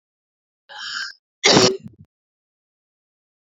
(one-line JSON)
{"cough_length": "3.5 s", "cough_amplitude": 31315, "cough_signal_mean_std_ratio": 0.28, "survey_phase": "beta (2021-08-13 to 2022-03-07)", "age": "45-64", "gender": "Female", "wearing_mask": "No", "symptom_cough_any": true, "symptom_runny_or_blocked_nose": true, "symptom_shortness_of_breath": true, "symptom_fatigue": true, "smoker_status": "Ex-smoker", "respiratory_condition_asthma": true, "respiratory_condition_other": false, "recruitment_source": "Test and Trace", "submission_delay": "2 days", "covid_test_method": "RT-qPCR", "covid_ct_value": 21.2, "covid_ct_gene": "ORF1ab gene"}